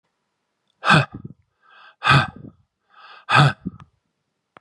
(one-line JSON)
{"exhalation_length": "4.6 s", "exhalation_amplitude": 29226, "exhalation_signal_mean_std_ratio": 0.32, "survey_phase": "beta (2021-08-13 to 2022-03-07)", "age": "18-44", "gender": "Male", "wearing_mask": "No", "symptom_runny_or_blocked_nose": true, "symptom_shortness_of_breath": true, "symptom_diarrhoea": true, "symptom_fatigue": true, "smoker_status": "Ex-smoker", "respiratory_condition_asthma": false, "respiratory_condition_other": false, "recruitment_source": "Test and Trace", "submission_delay": "3 days", "covid_test_method": "RT-qPCR", "covid_ct_value": 19.5, "covid_ct_gene": "ORF1ab gene", "covid_ct_mean": 19.9, "covid_viral_load": "290000 copies/ml", "covid_viral_load_category": "Low viral load (10K-1M copies/ml)"}